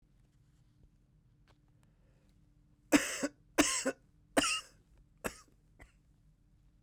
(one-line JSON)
{"three_cough_length": "6.8 s", "three_cough_amplitude": 8516, "three_cough_signal_mean_std_ratio": 0.28, "survey_phase": "beta (2021-08-13 to 2022-03-07)", "age": "18-44", "gender": "Male", "wearing_mask": "Yes", "symptom_cough_any": true, "symptom_shortness_of_breath": true, "symptom_fatigue": true, "symptom_headache": true, "symptom_change_to_sense_of_smell_or_taste": true, "symptom_onset": "6 days", "smoker_status": "Never smoked", "respiratory_condition_asthma": false, "respiratory_condition_other": false, "recruitment_source": "Test and Trace", "submission_delay": "2 days", "covid_test_result": "Positive", "covid_test_method": "RT-qPCR", "covid_ct_value": 14.5, "covid_ct_gene": "N gene", "covid_ct_mean": 15.1, "covid_viral_load": "11000000 copies/ml", "covid_viral_load_category": "High viral load (>1M copies/ml)"}